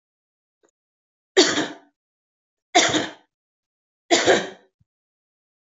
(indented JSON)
{
  "three_cough_length": "5.7 s",
  "three_cough_amplitude": 26470,
  "three_cough_signal_mean_std_ratio": 0.3,
  "survey_phase": "beta (2021-08-13 to 2022-03-07)",
  "age": "18-44",
  "gender": "Female",
  "wearing_mask": "Yes",
  "symptom_runny_or_blocked_nose": true,
  "symptom_fever_high_temperature": true,
  "symptom_headache": true,
  "symptom_change_to_sense_of_smell_or_taste": true,
  "symptom_other": true,
  "symptom_onset": "3 days",
  "smoker_status": "Never smoked",
  "respiratory_condition_asthma": false,
  "respiratory_condition_other": false,
  "recruitment_source": "Test and Trace",
  "submission_delay": "2 days",
  "covid_test_result": "Positive",
  "covid_test_method": "RT-qPCR",
  "covid_ct_value": 16.2,
  "covid_ct_gene": "ORF1ab gene",
  "covid_ct_mean": 16.6,
  "covid_viral_load": "3500000 copies/ml",
  "covid_viral_load_category": "High viral load (>1M copies/ml)"
}